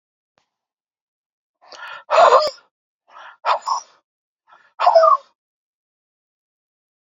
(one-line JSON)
{"exhalation_length": "7.1 s", "exhalation_amplitude": 32768, "exhalation_signal_mean_std_ratio": 0.3, "survey_phase": "alpha (2021-03-01 to 2021-08-12)", "age": "45-64", "gender": "Male", "wearing_mask": "No", "symptom_cough_any": true, "symptom_onset": "7 days", "smoker_status": "Never smoked", "respiratory_condition_asthma": false, "respiratory_condition_other": false, "recruitment_source": "Test and Trace", "submission_delay": "1 day", "covid_test_result": "Positive", "covid_test_method": "RT-qPCR", "covid_ct_value": 35.3, "covid_ct_gene": "ORF1ab gene"}